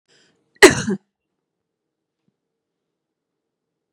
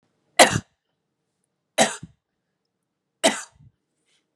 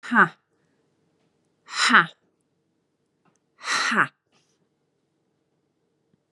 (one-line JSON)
{"cough_length": "3.9 s", "cough_amplitude": 32768, "cough_signal_mean_std_ratio": 0.16, "three_cough_length": "4.4 s", "three_cough_amplitude": 32767, "three_cough_signal_mean_std_ratio": 0.22, "exhalation_length": "6.3 s", "exhalation_amplitude": 26994, "exhalation_signal_mean_std_ratio": 0.26, "survey_phase": "beta (2021-08-13 to 2022-03-07)", "age": "45-64", "gender": "Female", "wearing_mask": "No", "symptom_none": true, "smoker_status": "Never smoked", "respiratory_condition_asthma": false, "respiratory_condition_other": false, "recruitment_source": "REACT", "submission_delay": "1 day", "covid_test_result": "Negative", "covid_test_method": "RT-qPCR", "influenza_a_test_result": "Negative", "influenza_b_test_result": "Negative"}